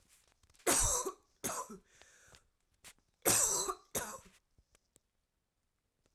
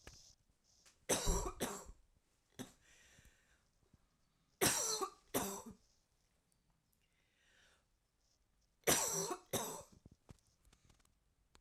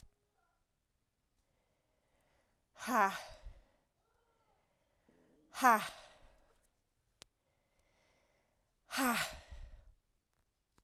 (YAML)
cough_length: 6.1 s
cough_amplitude: 6590
cough_signal_mean_std_ratio: 0.37
three_cough_length: 11.6 s
three_cough_amplitude: 4239
three_cough_signal_mean_std_ratio: 0.34
exhalation_length: 10.8 s
exhalation_amplitude: 7107
exhalation_signal_mean_std_ratio: 0.24
survey_phase: alpha (2021-03-01 to 2021-08-12)
age: 18-44
gender: Female
wearing_mask: 'No'
symptom_cough_any: true
symptom_diarrhoea: true
symptom_fatigue: true
symptom_onset: 5 days
smoker_status: Never smoked
respiratory_condition_asthma: false
respiratory_condition_other: false
recruitment_source: Test and Trace
submission_delay: 2 days
covid_test_result: Positive
covid_test_method: RT-qPCR
covid_ct_value: 17.9
covid_ct_gene: ORF1ab gene
covid_ct_mean: 18.2
covid_viral_load: 1100000 copies/ml
covid_viral_load_category: High viral load (>1M copies/ml)